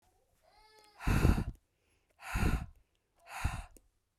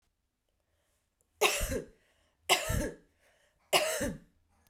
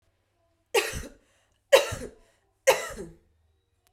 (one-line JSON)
{"exhalation_length": "4.2 s", "exhalation_amplitude": 8238, "exhalation_signal_mean_std_ratio": 0.38, "three_cough_length": "4.7 s", "three_cough_amplitude": 9909, "three_cough_signal_mean_std_ratio": 0.39, "cough_length": "3.9 s", "cough_amplitude": 20912, "cough_signal_mean_std_ratio": 0.28, "survey_phase": "beta (2021-08-13 to 2022-03-07)", "age": "18-44", "gender": "Female", "wearing_mask": "No", "symptom_none": true, "symptom_onset": "12 days", "smoker_status": "Never smoked", "respiratory_condition_asthma": false, "respiratory_condition_other": false, "recruitment_source": "REACT", "submission_delay": "1 day", "covid_test_result": "Negative", "covid_test_method": "RT-qPCR"}